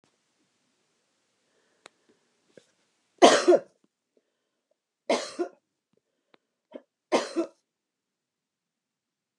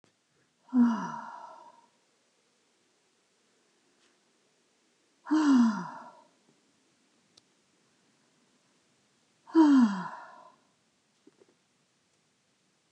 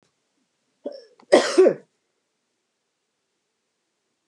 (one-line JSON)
{"three_cough_length": "9.4 s", "three_cough_amplitude": 26708, "three_cough_signal_mean_std_ratio": 0.2, "exhalation_length": "12.9 s", "exhalation_amplitude": 10101, "exhalation_signal_mean_std_ratio": 0.29, "cough_length": "4.3 s", "cough_amplitude": 29054, "cough_signal_mean_std_ratio": 0.23, "survey_phase": "beta (2021-08-13 to 2022-03-07)", "age": "45-64", "gender": "Female", "wearing_mask": "No", "symptom_none": true, "smoker_status": "Never smoked", "respiratory_condition_asthma": false, "respiratory_condition_other": false, "recruitment_source": "REACT", "submission_delay": "1 day", "covid_test_result": "Negative", "covid_test_method": "RT-qPCR", "influenza_a_test_result": "Negative", "influenza_b_test_result": "Negative"}